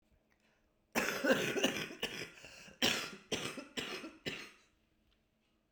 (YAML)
cough_length: 5.7 s
cough_amplitude: 5383
cough_signal_mean_std_ratio: 0.47
survey_phase: beta (2021-08-13 to 2022-03-07)
age: 45-64
gender: Female
wearing_mask: 'No'
symptom_new_continuous_cough: true
symptom_runny_or_blocked_nose: true
symptom_sore_throat: true
symptom_fatigue: true
symptom_fever_high_temperature: true
smoker_status: Prefer not to say
respiratory_condition_asthma: true
respiratory_condition_other: false
recruitment_source: Test and Trace
submission_delay: 3 days
covid_test_result: Positive
covid_test_method: RT-qPCR
covid_ct_value: 34.0
covid_ct_gene: N gene
covid_ct_mean: 34.0
covid_viral_load: 7.1 copies/ml
covid_viral_load_category: Minimal viral load (< 10K copies/ml)